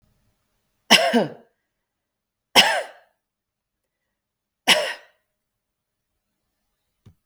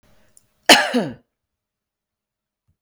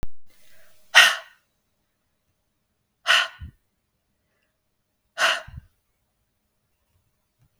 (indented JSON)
{
  "three_cough_length": "7.3 s",
  "three_cough_amplitude": 32768,
  "three_cough_signal_mean_std_ratio": 0.25,
  "cough_length": "2.8 s",
  "cough_amplitude": 32768,
  "cough_signal_mean_std_ratio": 0.24,
  "exhalation_length": "7.6 s",
  "exhalation_amplitude": 32768,
  "exhalation_signal_mean_std_ratio": 0.25,
  "survey_phase": "beta (2021-08-13 to 2022-03-07)",
  "age": "45-64",
  "gender": "Female",
  "wearing_mask": "No",
  "symptom_cough_any": true,
  "symptom_runny_or_blocked_nose": true,
  "symptom_fatigue": true,
  "smoker_status": "Never smoked",
  "respiratory_condition_asthma": false,
  "respiratory_condition_other": false,
  "recruitment_source": "Test and Trace",
  "submission_delay": "1 day",
  "covid_test_result": "Negative",
  "covid_test_method": "RT-qPCR"
}